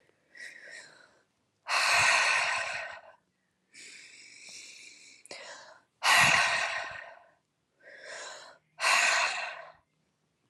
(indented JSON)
{
  "exhalation_length": "10.5 s",
  "exhalation_amplitude": 10129,
  "exhalation_signal_mean_std_ratio": 0.46,
  "survey_phase": "alpha (2021-03-01 to 2021-08-12)",
  "age": "18-44",
  "gender": "Female",
  "wearing_mask": "No",
  "symptom_cough_any": true,
  "symptom_new_continuous_cough": true,
  "symptom_fatigue": true,
  "symptom_headache": true,
  "symptom_onset": "3 days",
  "smoker_status": "Never smoked",
  "respiratory_condition_asthma": false,
  "respiratory_condition_other": false,
  "recruitment_source": "Test and Trace",
  "submission_delay": "2 days",
  "covid_test_result": "Positive",
  "covid_test_method": "RT-qPCR"
}